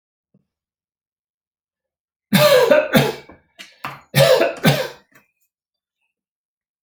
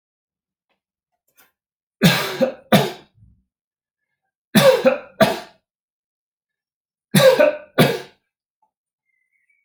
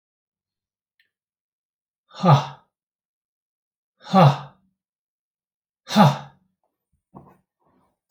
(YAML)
cough_length: 6.8 s
cough_amplitude: 30189
cough_signal_mean_std_ratio: 0.37
three_cough_length: 9.6 s
three_cough_amplitude: 32767
three_cough_signal_mean_std_ratio: 0.33
exhalation_length: 8.1 s
exhalation_amplitude: 26428
exhalation_signal_mean_std_ratio: 0.23
survey_phase: alpha (2021-03-01 to 2021-08-12)
age: 45-64
gender: Male
wearing_mask: 'No'
symptom_none: true
smoker_status: Never smoked
respiratory_condition_asthma: false
respiratory_condition_other: false
recruitment_source: REACT
submission_delay: 2 days
covid_test_result: Negative
covid_test_method: RT-qPCR